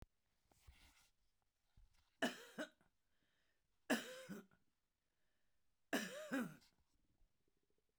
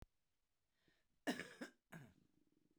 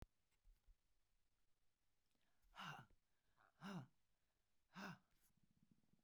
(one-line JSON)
{"three_cough_length": "8.0 s", "three_cough_amplitude": 1907, "three_cough_signal_mean_std_ratio": 0.3, "cough_length": "2.8 s", "cough_amplitude": 1073, "cough_signal_mean_std_ratio": 0.28, "exhalation_length": "6.0 s", "exhalation_amplitude": 302, "exhalation_signal_mean_std_ratio": 0.39, "survey_phase": "beta (2021-08-13 to 2022-03-07)", "age": "65+", "gender": "Female", "wearing_mask": "No", "symptom_cough_any": true, "symptom_onset": "8 days", "smoker_status": "Ex-smoker", "respiratory_condition_asthma": false, "respiratory_condition_other": false, "recruitment_source": "REACT", "submission_delay": "2 days", "covid_test_result": "Negative", "covid_test_method": "RT-qPCR"}